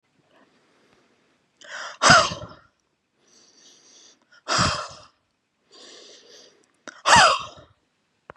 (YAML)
exhalation_length: 8.4 s
exhalation_amplitude: 31558
exhalation_signal_mean_std_ratio: 0.28
survey_phase: beta (2021-08-13 to 2022-03-07)
age: 18-44
gender: Male
wearing_mask: 'No'
symptom_none: true
smoker_status: Never smoked
respiratory_condition_asthma: false
respiratory_condition_other: false
recruitment_source: REACT
submission_delay: 10 days
covid_test_result: Negative
covid_test_method: RT-qPCR
influenza_a_test_result: Negative
influenza_b_test_result: Negative